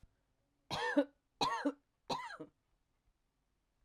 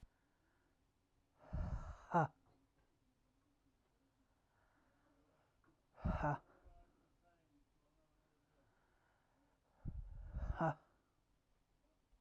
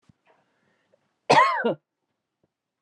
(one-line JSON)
{"three_cough_length": "3.8 s", "three_cough_amplitude": 4102, "three_cough_signal_mean_std_ratio": 0.36, "exhalation_length": "12.2 s", "exhalation_amplitude": 2032, "exhalation_signal_mean_std_ratio": 0.29, "cough_length": "2.8 s", "cough_amplitude": 20361, "cough_signal_mean_std_ratio": 0.3, "survey_phase": "alpha (2021-03-01 to 2021-08-12)", "age": "45-64", "gender": "Female", "wearing_mask": "No", "symptom_none": true, "smoker_status": "Never smoked", "respiratory_condition_asthma": false, "respiratory_condition_other": false, "recruitment_source": "REACT", "submission_delay": "1 day", "covid_test_result": "Negative", "covid_test_method": "RT-qPCR"}